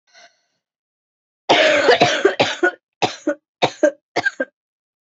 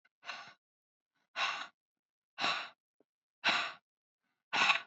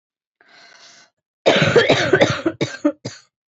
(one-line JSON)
{"three_cough_length": "5.0 s", "three_cough_amplitude": 32767, "three_cough_signal_mean_std_ratio": 0.44, "exhalation_length": "4.9 s", "exhalation_amplitude": 6533, "exhalation_signal_mean_std_ratio": 0.37, "cough_length": "3.5 s", "cough_amplitude": 30534, "cough_signal_mean_std_ratio": 0.46, "survey_phase": "beta (2021-08-13 to 2022-03-07)", "age": "18-44", "gender": "Female", "wearing_mask": "No", "symptom_cough_any": true, "symptom_runny_or_blocked_nose": true, "symptom_sore_throat": true, "symptom_fatigue": true, "symptom_fever_high_temperature": true, "symptom_headache": true, "symptom_change_to_sense_of_smell_or_taste": true, "symptom_loss_of_taste": true, "symptom_onset": "2 days", "smoker_status": "Never smoked", "respiratory_condition_asthma": false, "respiratory_condition_other": false, "recruitment_source": "Test and Trace", "submission_delay": "2 days", "covid_test_result": "Positive", "covid_test_method": "RT-qPCR"}